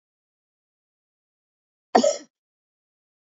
{
  "cough_length": "3.3 s",
  "cough_amplitude": 23130,
  "cough_signal_mean_std_ratio": 0.18,
  "survey_phase": "beta (2021-08-13 to 2022-03-07)",
  "age": "45-64",
  "gender": "Female",
  "wearing_mask": "No",
  "symptom_runny_or_blocked_nose": true,
  "symptom_sore_throat": true,
  "symptom_headache": true,
  "symptom_onset": "2 days",
  "smoker_status": "Never smoked",
  "respiratory_condition_asthma": false,
  "respiratory_condition_other": false,
  "recruitment_source": "REACT",
  "submission_delay": "1 day",
  "covid_test_result": "Negative",
  "covid_test_method": "RT-qPCR",
  "influenza_a_test_result": "Negative",
  "influenza_b_test_result": "Negative"
}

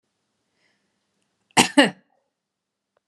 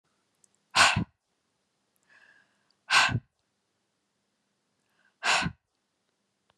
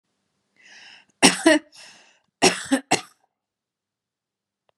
{
  "cough_length": "3.1 s",
  "cough_amplitude": 32206,
  "cough_signal_mean_std_ratio": 0.2,
  "exhalation_length": "6.6 s",
  "exhalation_amplitude": 18983,
  "exhalation_signal_mean_std_ratio": 0.27,
  "three_cough_length": "4.8 s",
  "three_cough_amplitude": 32767,
  "three_cough_signal_mean_std_ratio": 0.27,
  "survey_phase": "beta (2021-08-13 to 2022-03-07)",
  "age": "45-64",
  "gender": "Female",
  "wearing_mask": "No",
  "symptom_none": true,
  "smoker_status": "Ex-smoker",
  "respiratory_condition_asthma": false,
  "respiratory_condition_other": false,
  "recruitment_source": "REACT",
  "submission_delay": "2 days",
  "covid_test_result": "Negative",
  "covid_test_method": "RT-qPCR",
  "influenza_a_test_result": "Negative",
  "influenza_b_test_result": "Negative"
}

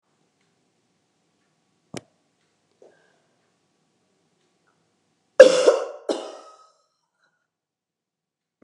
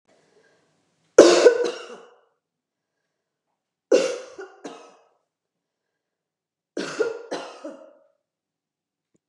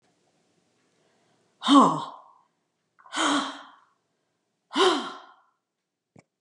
{
  "cough_length": "8.6 s",
  "cough_amplitude": 32768,
  "cough_signal_mean_std_ratio": 0.16,
  "three_cough_length": "9.3 s",
  "three_cough_amplitude": 32768,
  "three_cough_signal_mean_std_ratio": 0.24,
  "exhalation_length": "6.4 s",
  "exhalation_amplitude": 21696,
  "exhalation_signal_mean_std_ratio": 0.3,
  "survey_phase": "beta (2021-08-13 to 2022-03-07)",
  "age": "65+",
  "gender": "Female",
  "wearing_mask": "No",
  "symptom_none": true,
  "smoker_status": "Never smoked",
  "respiratory_condition_asthma": true,
  "respiratory_condition_other": false,
  "recruitment_source": "REACT",
  "submission_delay": "3 days",
  "covid_test_result": "Negative",
  "covid_test_method": "RT-qPCR",
  "influenza_a_test_result": "Negative",
  "influenza_b_test_result": "Negative"
}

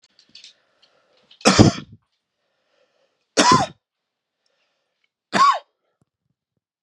{
  "three_cough_length": "6.8 s",
  "three_cough_amplitude": 32768,
  "three_cough_signal_mean_std_ratio": 0.27,
  "survey_phase": "beta (2021-08-13 to 2022-03-07)",
  "age": "18-44",
  "gender": "Male",
  "wearing_mask": "No",
  "symptom_cough_any": true,
  "symptom_sore_throat": true,
  "symptom_headache": true,
  "symptom_change_to_sense_of_smell_or_taste": true,
  "symptom_onset": "4 days",
  "smoker_status": "Never smoked",
  "respiratory_condition_asthma": false,
  "respiratory_condition_other": false,
  "recruitment_source": "Test and Trace",
  "submission_delay": "1 day",
  "covid_test_result": "Positive",
  "covid_test_method": "RT-qPCR",
  "covid_ct_value": 16.3,
  "covid_ct_gene": "ORF1ab gene",
  "covid_ct_mean": 16.6,
  "covid_viral_load": "3600000 copies/ml",
  "covid_viral_load_category": "High viral load (>1M copies/ml)"
}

